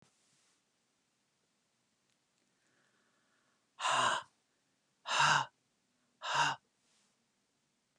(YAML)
exhalation_length: 8.0 s
exhalation_amplitude: 5219
exhalation_signal_mean_std_ratio: 0.3
survey_phase: beta (2021-08-13 to 2022-03-07)
age: 65+
gender: Female
wearing_mask: 'No'
symptom_none: true
smoker_status: Never smoked
respiratory_condition_asthma: false
respiratory_condition_other: false
recruitment_source: REACT
submission_delay: 1 day
covid_test_result: Negative
covid_test_method: RT-qPCR